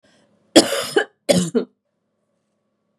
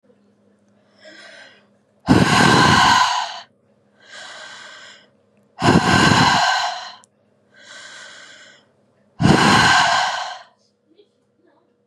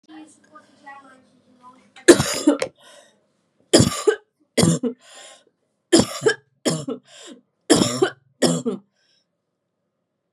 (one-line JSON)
{"cough_length": "3.0 s", "cough_amplitude": 32768, "cough_signal_mean_std_ratio": 0.32, "exhalation_length": "11.9 s", "exhalation_amplitude": 32601, "exhalation_signal_mean_std_ratio": 0.47, "three_cough_length": "10.3 s", "three_cough_amplitude": 32768, "three_cough_signal_mean_std_ratio": 0.34, "survey_phase": "beta (2021-08-13 to 2022-03-07)", "age": "18-44", "gender": "Female", "wearing_mask": "No", "symptom_cough_any": true, "symptom_new_continuous_cough": true, "symptom_shortness_of_breath": true, "symptom_fatigue": true, "symptom_other": true, "symptom_onset": "6 days", "smoker_status": "Ex-smoker", "respiratory_condition_asthma": false, "respiratory_condition_other": false, "recruitment_source": "Test and Trace", "submission_delay": "1 day", "covid_test_result": "Positive", "covid_test_method": "ePCR"}